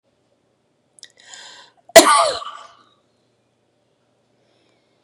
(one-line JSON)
{"cough_length": "5.0 s", "cough_amplitude": 32768, "cough_signal_mean_std_ratio": 0.21, "survey_phase": "beta (2021-08-13 to 2022-03-07)", "age": "45-64", "gender": "Female", "wearing_mask": "No", "symptom_cough_any": true, "symptom_runny_or_blocked_nose": true, "symptom_sore_throat": true, "symptom_onset": "10 days", "smoker_status": "Ex-smoker", "respiratory_condition_asthma": false, "respiratory_condition_other": false, "recruitment_source": "REACT", "submission_delay": "6 days", "covid_test_result": "Negative", "covid_test_method": "RT-qPCR", "influenza_a_test_result": "Negative", "influenza_b_test_result": "Negative"}